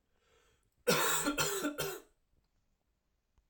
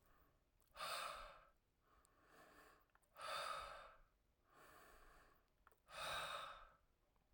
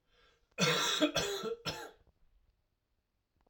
{"three_cough_length": "3.5 s", "three_cough_amplitude": 4741, "three_cough_signal_mean_std_ratio": 0.44, "exhalation_length": "7.3 s", "exhalation_amplitude": 532, "exhalation_signal_mean_std_ratio": 0.51, "cough_length": "3.5 s", "cough_amplitude": 5916, "cough_signal_mean_std_ratio": 0.45, "survey_phase": "alpha (2021-03-01 to 2021-08-12)", "age": "45-64", "gender": "Male", "wearing_mask": "No", "symptom_cough_any": true, "symptom_change_to_sense_of_smell_or_taste": true, "symptom_onset": "5 days", "smoker_status": "Never smoked", "respiratory_condition_asthma": false, "respiratory_condition_other": false, "recruitment_source": "Test and Trace", "submission_delay": "1 day", "covid_test_result": "Positive", "covid_test_method": "RT-qPCR", "covid_ct_value": 21.6, "covid_ct_gene": "ORF1ab gene"}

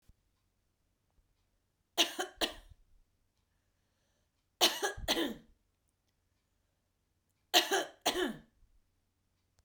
{"three_cough_length": "9.6 s", "three_cough_amplitude": 9729, "three_cough_signal_mean_std_ratio": 0.28, "survey_phase": "beta (2021-08-13 to 2022-03-07)", "age": "45-64", "gender": "Female", "wearing_mask": "No", "symptom_runny_or_blocked_nose": true, "symptom_sore_throat": true, "symptom_headache": true, "symptom_onset": "3 days", "smoker_status": "Ex-smoker", "respiratory_condition_asthma": false, "respiratory_condition_other": false, "recruitment_source": "Test and Trace", "submission_delay": "1 day", "covid_test_result": "Positive", "covid_test_method": "RT-qPCR", "covid_ct_value": 31.0, "covid_ct_gene": "N gene"}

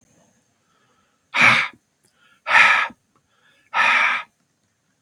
{"exhalation_length": "5.0 s", "exhalation_amplitude": 29441, "exhalation_signal_mean_std_ratio": 0.39, "survey_phase": "beta (2021-08-13 to 2022-03-07)", "age": "45-64", "gender": "Male", "wearing_mask": "No", "symptom_cough_any": true, "symptom_sore_throat": true, "smoker_status": "Ex-smoker", "respiratory_condition_asthma": false, "respiratory_condition_other": false, "recruitment_source": "Test and Trace", "submission_delay": "1 day", "covid_test_result": "Positive", "covid_test_method": "LFT"}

